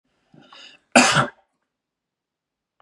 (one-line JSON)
{"cough_length": "2.8 s", "cough_amplitude": 32768, "cough_signal_mean_std_ratio": 0.25, "survey_phase": "beta (2021-08-13 to 2022-03-07)", "age": "18-44", "gender": "Male", "wearing_mask": "No", "symptom_none": true, "smoker_status": "Never smoked", "respiratory_condition_asthma": false, "respiratory_condition_other": false, "recruitment_source": "REACT", "submission_delay": "1 day", "covid_test_result": "Negative", "covid_test_method": "RT-qPCR", "influenza_a_test_result": "Negative", "influenza_b_test_result": "Negative"}